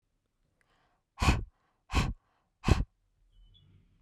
exhalation_length: 4.0 s
exhalation_amplitude: 10980
exhalation_signal_mean_std_ratio: 0.29
survey_phase: beta (2021-08-13 to 2022-03-07)
age: 18-44
gender: Female
wearing_mask: 'No'
symptom_cough_any: true
symptom_runny_or_blocked_nose: true
symptom_shortness_of_breath: true
symptom_sore_throat: true
symptom_abdominal_pain: true
symptom_diarrhoea: true
symptom_fatigue: true
symptom_fever_high_temperature: true
symptom_change_to_sense_of_smell_or_taste: true
symptom_loss_of_taste: true
smoker_status: Current smoker (e-cigarettes or vapes only)
respiratory_condition_asthma: false
respiratory_condition_other: false
recruitment_source: Test and Trace
submission_delay: 1 day
covid_test_result: Positive
covid_test_method: LFT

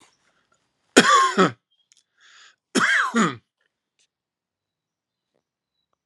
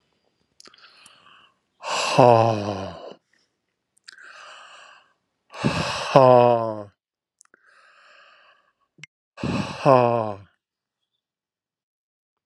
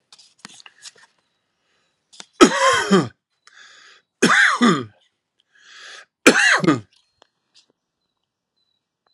cough_length: 6.1 s
cough_amplitude: 32768
cough_signal_mean_std_ratio: 0.32
exhalation_length: 12.5 s
exhalation_amplitude: 32669
exhalation_signal_mean_std_ratio: 0.3
three_cough_length: 9.1 s
three_cough_amplitude: 32768
three_cough_signal_mean_std_ratio: 0.33
survey_phase: alpha (2021-03-01 to 2021-08-12)
age: 45-64
gender: Male
wearing_mask: 'No'
symptom_cough_any: true
symptom_shortness_of_breath: true
symptom_onset: 10 days
smoker_status: Ex-smoker
respiratory_condition_asthma: false
respiratory_condition_other: false
recruitment_source: Test and Trace
submission_delay: 2 days
covid_test_result: Positive
covid_test_method: RT-qPCR
covid_ct_value: 16.1
covid_ct_gene: N gene
covid_ct_mean: 16.3
covid_viral_load: 4500000 copies/ml
covid_viral_load_category: High viral load (>1M copies/ml)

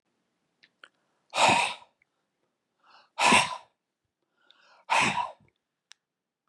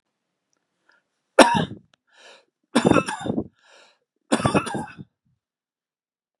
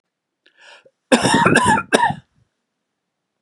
exhalation_length: 6.5 s
exhalation_amplitude: 17053
exhalation_signal_mean_std_ratio: 0.32
three_cough_length: 6.4 s
three_cough_amplitude: 32768
three_cough_signal_mean_std_ratio: 0.29
cough_length: 3.4 s
cough_amplitude: 32768
cough_signal_mean_std_ratio: 0.42
survey_phase: beta (2021-08-13 to 2022-03-07)
age: 65+
gender: Male
wearing_mask: 'No'
symptom_cough_any: true
smoker_status: Ex-smoker
respiratory_condition_asthma: false
respiratory_condition_other: false
recruitment_source: REACT
submission_delay: 2 days
covid_test_result: Negative
covid_test_method: RT-qPCR
influenza_a_test_result: Negative
influenza_b_test_result: Negative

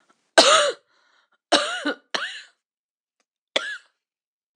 three_cough_length: 4.6 s
three_cough_amplitude: 26028
three_cough_signal_mean_std_ratio: 0.32
survey_phase: beta (2021-08-13 to 2022-03-07)
age: 45-64
gender: Female
wearing_mask: 'No'
symptom_cough_any: true
symptom_runny_or_blocked_nose: true
symptom_sore_throat: true
symptom_fatigue: true
symptom_fever_high_temperature: true
symptom_headache: true
symptom_other: true
symptom_onset: 8 days
smoker_status: Never smoked
respiratory_condition_asthma: false
respiratory_condition_other: false
recruitment_source: Test and Trace
submission_delay: 1 day
covid_test_result: Positive
covid_test_method: RT-qPCR
covid_ct_value: 30.3
covid_ct_gene: N gene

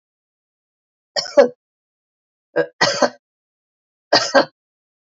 three_cough_length: 5.1 s
three_cough_amplitude: 32768
three_cough_signal_mean_std_ratio: 0.29
survey_phase: beta (2021-08-13 to 2022-03-07)
age: 45-64
gender: Female
wearing_mask: 'No'
symptom_none: true
smoker_status: Ex-smoker
respiratory_condition_asthma: false
respiratory_condition_other: false
recruitment_source: REACT
submission_delay: 0 days
covid_test_result: Negative
covid_test_method: RT-qPCR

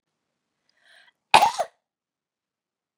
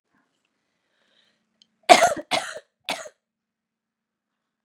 cough_length: 3.0 s
cough_amplitude: 32767
cough_signal_mean_std_ratio: 0.19
three_cough_length: 4.6 s
three_cough_amplitude: 32768
three_cough_signal_mean_std_ratio: 0.2
survey_phase: beta (2021-08-13 to 2022-03-07)
age: 18-44
gender: Female
wearing_mask: 'No'
symptom_cough_any: true
symptom_runny_or_blocked_nose: true
symptom_shortness_of_breath: true
symptom_sore_throat: true
symptom_fatigue: true
smoker_status: Never smoked
respiratory_condition_asthma: false
respiratory_condition_other: false
recruitment_source: Test and Trace
submission_delay: 2 days
covid_test_result: Negative
covid_test_method: RT-qPCR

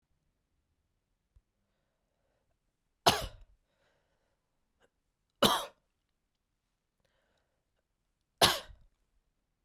three_cough_length: 9.6 s
three_cough_amplitude: 18230
three_cough_signal_mean_std_ratio: 0.17
survey_phase: beta (2021-08-13 to 2022-03-07)
age: 18-44
gender: Male
wearing_mask: 'No'
symptom_cough_any: true
symptom_runny_or_blocked_nose: true
symptom_sore_throat: true
symptom_abdominal_pain: true
symptom_fatigue: true
symptom_headache: true
smoker_status: Never smoked
respiratory_condition_asthma: false
respiratory_condition_other: false
recruitment_source: Test and Trace
submission_delay: 1 day
covid_test_method: LFT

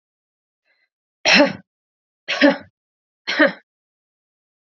three_cough_length: 4.7 s
three_cough_amplitude: 29737
three_cough_signal_mean_std_ratio: 0.29
survey_phase: beta (2021-08-13 to 2022-03-07)
age: 18-44
gender: Female
wearing_mask: 'No'
symptom_runny_or_blocked_nose: true
symptom_sore_throat: true
symptom_fatigue: true
symptom_headache: true
symptom_change_to_sense_of_smell_or_taste: true
symptom_loss_of_taste: true
smoker_status: Never smoked
respiratory_condition_asthma: false
respiratory_condition_other: false
recruitment_source: Test and Trace
submission_delay: 2 days
covid_test_result: Positive
covid_test_method: RT-qPCR
covid_ct_value: 15.4
covid_ct_gene: ORF1ab gene
covid_ct_mean: 15.6
covid_viral_load: 7900000 copies/ml
covid_viral_load_category: High viral load (>1M copies/ml)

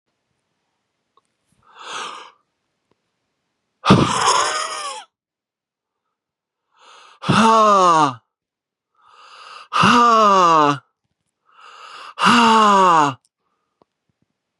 exhalation_length: 14.6 s
exhalation_amplitude: 32767
exhalation_signal_mean_std_ratio: 0.43
survey_phase: beta (2021-08-13 to 2022-03-07)
age: 18-44
gender: Male
wearing_mask: 'No'
symptom_cough_any: true
symptom_runny_or_blocked_nose: true
symptom_headache: true
symptom_onset: 3 days
smoker_status: Never smoked
respiratory_condition_asthma: false
respiratory_condition_other: false
recruitment_source: Test and Trace
submission_delay: 2 days
covid_test_result: Positive
covid_test_method: RT-qPCR
covid_ct_value: 23.1
covid_ct_gene: N gene
covid_ct_mean: 23.7
covid_viral_load: 17000 copies/ml
covid_viral_load_category: Low viral load (10K-1M copies/ml)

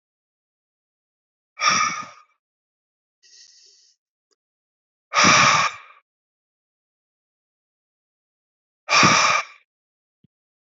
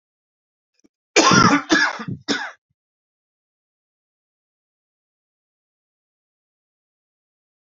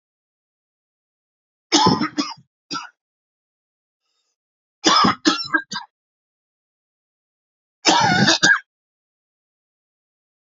exhalation_length: 10.7 s
exhalation_amplitude: 26105
exhalation_signal_mean_std_ratio: 0.3
cough_length: 7.8 s
cough_amplitude: 32559
cough_signal_mean_std_ratio: 0.26
three_cough_length: 10.5 s
three_cough_amplitude: 32767
three_cough_signal_mean_std_ratio: 0.33
survey_phase: beta (2021-08-13 to 2022-03-07)
age: 45-64
gender: Male
wearing_mask: 'No'
symptom_cough_any: true
symptom_new_continuous_cough: true
symptom_runny_or_blocked_nose: true
symptom_shortness_of_breath: true
symptom_sore_throat: true
symptom_fatigue: true
symptom_fever_high_temperature: true
symptom_onset: 5 days
smoker_status: Ex-smoker
respiratory_condition_asthma: false
respiratory_condition_other: false
recruitment_source: Test and Trace
submission_delay: 2 days
covid_test_result: Positive
covid_test_method: RT-qPCR
covid_ct_value: 11.6
covid_ct_gene: ORF1ab gene
covid_ct_mean: 11.9
covid_viral_load: 130000000 copies/ml
covid_viral_load_category: High viral load (>1M copies/ml)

